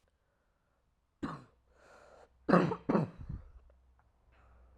{
  "cough_length": "4.8 s",
  "cough_amplitude": 10311,
  "cough_signal_mean_std_ratio": 0.29,
  "survey_phase": "alpha (2021-03-01 to 2021-08-12)",
  "age": "18-44",
  "gender": "Female",
  "wearing_mask": "No",
  "symptom_cough_any": true,
  "symptom_shortness_of_breath": true,
  "symptom_diarrhoea": true,
  "symptom_fatigue": true,
  "symptom_fever_high_temperature": true,
  "symptom_headache": true,
  "symptom_onset": "4 days",
  "smoker_status": "Never smoked",
  "respiratory_condition_asthma": true,
  "respiratory_condition_other": false,
  "recruitment_source": "Test and Trace",
  "submission_delay": "2 days",
  "covid_test_result": "Positive",
  "covid_test_method": "RT-qPCR"
}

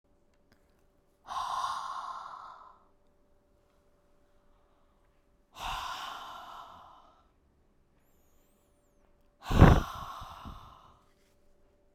{
  "exhalation_length": "11.9 s",
  "exhalation_amplitude": 23281,
  "exhalation_signal_mean_std_ratio": 0.24,
  "survey_phase": "beta (2021-08-13 to 2022-03-07)",
  "age": "45-64",
  "gender": "Female",
  "wearing_mask": "No",
  "symptom_none": true,
  "symptom_onset": "8 days",
  "smoker_status": "Never smoked",
  "respiratory_condition_asthma": false,
  "respiratory_condition_other": false,
  "recruitment_source": "REACT",
  "submission_delay": "2 days",
  "covid_test_result": "Negative",
  "covid_test_method": "RT-qPCR"
}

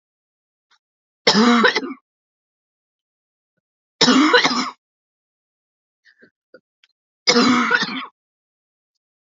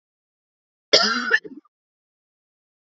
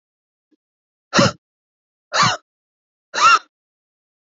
{
  "three_cough_length": "9.3 s",
  "three_cough_amplitude": 32319,
  "three_cough_signal_mean_std_ratio": 0.36,
  "cough_length": "2.9 s",
  "cough_amplitude": 31279,
  "cough_signal_mean_std_ratio": 0.28,
  "exhalation_length": "4.4 s",
  "exhalation_amplitude": 27680,
  "exhalation_signal_mean_std_ratio": 0.3,
  "survey_phase": "beta (2021-08-13 to 2022-03-07)",
  "age": "18-44",
  "gender": "Female",
  "wearing_mask": "No",
  "symptom_cough_any": true,
  "symptom_runny_or_blocked_nose": true,
  "symptom_fatigue": true,
  "symptom_headache": true,
  "symptom_onset": "3 days",
  "smoker_status": "Never smoked",
  "respiratory_condition_asthma": false,
  "respiratory_condition_other": false,
  "recruitment_source": "Test and Trace",
  "submission_delay": "1 day",
  "covid_test_result": "Negative",
  "covid_test_method": "RT-qPCR"
}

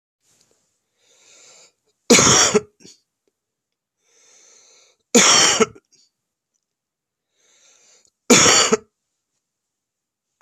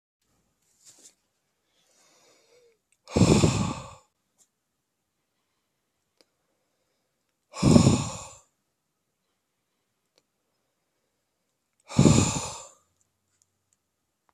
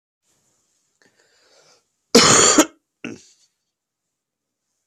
{
  "three_cough_length": "10.4 s",
  "three_cough_amplitude": 32768,
  "three_cough_signal_mean_std_ratio": 0.3,
  "exhalation_length": "14.3 s",
  "exhalation_amplitude": 22865,
  "exhalation_signal_mean_std_ratio": 0.25,
  "cough_length": "4.9 s",
  "cough_amplitude": 32767,
  "cough_signal_mean_std_ratio": 0.26,
  "survey_phase": "beta (2021-08-13 to 2022-03-07)",
  "age": "18-44",
  "gender": "Male",
  "wearing_mask": "No",
  "symptom_sore_throat": true,
  "smoker_status": "Current smoker (11 or more cigarettes per day)",
  "respiratory_condition_asthma": false,
  "respiratory_condition_other": false,
  "recruitment_source": "Test and Trace",
  "submission_delay": "2 days",
  "covid_test_result": "Positive",
  "covid_test_method": "RT-qPCR",
  "covid_ct_value": 16.3,
  "covid_ct_gene": "ORF1ab gene",
  "covid_ct_mean": 16.7,
  "covid_viral_load": "3400000 copies/ml",
  "covid_viral_load_category": "High viral load (>1M copies/ml)"
}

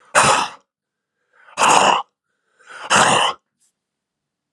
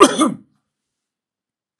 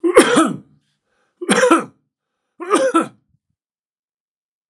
{
  "exhalation_length": "4.5 s",
  "exhalation_amplitude": 32768,
  "exhalation_signal_mean_std_ratio": 0.43,
  "cough_length": "1.8 s",
  "cough_amplitude": 32768,
  "cough_signal_mean_std_ratio": 0.29,
  "three_cough_length": "4.7 s",
  "three_cough_amplitude": 32768,
  "three_cough_signal_mean_std_ratio": 0.4,
  "survey_phase": "beta (2021-08-13 to 2022-03-07)",
  "age": "65+",
  "gender": "Male",
  "wearing_mask": "No",
  "symptom_none": true,
  "smoker_status": "Ex-smoker",
  "respiratory_condition_asthma": true,
  "respiratory_condition_other": false,
  "recruitment_source": "REACT",
  "submission_delay": "1 day",
  "covid_test_result": "Negative",
  "covid_test_method": "RT-qPCR"
}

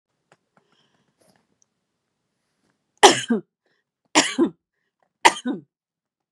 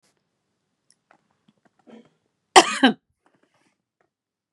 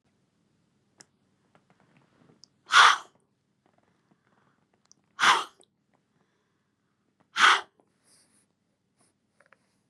{
  "three_cough_length": "6.3 s",
  "three_cough_amplitude": 32768,
  "three_cough_signal_mean_std_ratio": 0.22,
  "cough_length": "4.5 s",
  "cough_amplitude": 32768,
  "cough_signal_mean_std_ratio": 0.16,
  "exhalation_length": "9.9 s",
  "exhalation_amplitude": 22465,
  "exhalation_signal_mean_std_ratio": 0.2,
  "survey_phase": "beta (2021-08-13 to 2022-03-07)",
  "age": "45-64",
  "gender": "Female",
  "wearing_mask": "No",
  "symptom_none": true,
  "smoker_status": "Never smoked",
  "respiratory_condition_asthma": true,
  "respiratory_condition_other": false,
  "recruitment_source": "REACT",
  "submission_delay": "2 days",
  "covid_test_result": "Negative",
  "covid_test_method": "RT-qPCR",
  "influenza_a_test_result": "Negative",
  "influenza_b_test_result": "Negative"
}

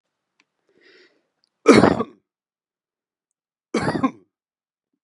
{
  "cough_length": "5.0 s",
  "cough_amplitude": 32767,
  "cough_signal_mean_std_ratio": 0.24,
  "survey_phase": "beta (2021-08-13 to 2022-03-07)",
  "age": "45-64",
  "gender": "Male",
  "wearing_mask": "No",
  "symptom_none": true,
  "smoker_status": "Never smoked",
  "respiratory_condition_asthma": false,
  "respiratory_condition_other": false,
  "recruitment_source": "REACT",
  "submission_delay": "1 day",
  "covid_test_result": "Negative",
  "covid_test_method": "RT-qPCR",
  "influenza_a_test_result": "Negative",
  "influenza_b_test_result": "Negative"
}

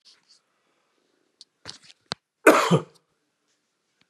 {
  "cough_length": "4.1 s",
  "cough_amplitude": 32403,
  "cough_signal_mean_std_ratio": 0.21,
  "survey_phase": "beta (2021-08-13 to 2022-03-07)",
  "age": "45-64",
  "gender": "Male",
  "wearing_mask": "No",
  "symptom_none": true,
  "smoker_status": "Current smoker (11 or more cigarettes per day)",
  "respiratory_condition_asthma": false,
  "respiratory_condition_other": false,
  "recruitment_source": "REACT",
  "submission_delay": "1 day",
  "covid_test_result": "Negative",
  "covid_test_method": "RT-qPCR",
  "influenza_a_test_result": "Negative",
  "influenza_b_test_result": "Negative"
}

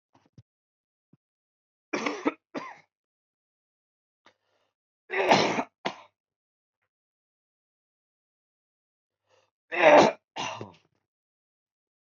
{
  "three_cough_length": "12.0 s",
  "three_cough_amplitude": 19377,
  "three_cough_signal_mean_std_ratio": 0.23,
  "survey_phase": "beta (2021-08-13 to 2022-03-07)",
  "age": "18-44",
  "gender": "Male",
  "wearing_mask": "No",
  "symptom_cough_any": true,
  "symptom_new_continuous_cough": true,
  "symptom_runny_or_blocked_nose": true,
  "symptom_sore_throat": true,
  "symptom_fatigue": true,
  "symptom_change_to_sense_of_smell_or_taste": true,
  "symptom_onset": "4 days",
  "smoker_status": "Current smoker (e-cigarettes or vapes only)",
  "respiratory_condition_asthma": false,
  "respiratory_condition_other": false,
  "recruitment_source": "Test and Trace",
  "submission_delay": "1 day",
  "covid_test_result": "Positive",
  "covid_test_method": "ePCR"
}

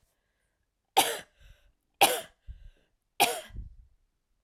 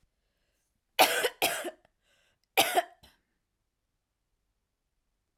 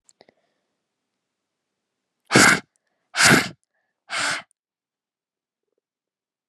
{
  "three_cough_length": "4.4 s",
  "three_cough_amplitude": 15509,
  "three_cough_signal_mean_std_ratio": 0.27,
  "cough_length": "5.4 s",
  "cough_amplitude": 15076,
  "cough_signal_mean_std_ratio": 0.27,
  "exhalation_length": "6.5 s",
  "exhalation_amplitude": 30691,
  "exhalation_signal_mean_std_ratio": 0.26,
  "survey_phase": "alpha (2021-03-01 to 2021-08-12)",
  "age": "18-44",
  "gender": "Female",
  "wearing_mask": "No",
  "symptom_none": true,
  "smoker_status": "Never smoked",
  "respiratory_condition_asthma": false,
  "respiratory_condition_other": false,
  "recruitment_source": "REACT",
  "submission_delay": "3 days",
  "covid_test_result": "Negative",
  "covid_test_method": "RT-qPCR"
}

